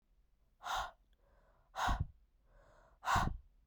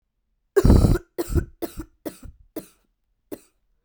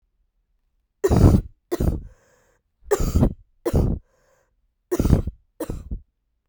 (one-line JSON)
{"exhalation_length": "3.7 s", "exhalation_amplitude": 3190, "exhalation_signal_mean_std_ratio": 0.4, "cough_length": "3.8 s", "cough_amplitude": 24713, "cough_signal_mean_std_ratio": 0.34, "three_cough_length": "6.5 s", "three_cough_amplitude": 32767, "three_cough_signal_mean_std_ratio": 0.4, "survey_phase": "beta (2021-08-13 to 2022-03-07)", "age": "18-44", "gender": "Female", "wearing_mask": "No", "symptom_cough_any": true, "symptom_runny_or_blocked_nose": true, "symptom_shortness_of_breath": true, "symptom_sore_throat": true, "symptom_abdominal_pain": true, "symptom_fatigue": true, "symptom_fever_high_temperature": true, "symptom_headache": true, "symptom_change_to_sense_of_smell_or_taste": true, "symptom_loss_of_taste": true, "symptom_other": true, "symptom_onset": "2 days", "smoker_status": "Never smoked", "respiratory_condition_asthma": false, "respiratory_condition_other": false, "recruitment_source": "Test and Trace", "submission_delay": "1 day", "covid_test_result": "Positive", "covid_test_method": "RT-qPCR", "covid_ct_value": 19.9, "covid_ct_gene": "ORF1ab gene"}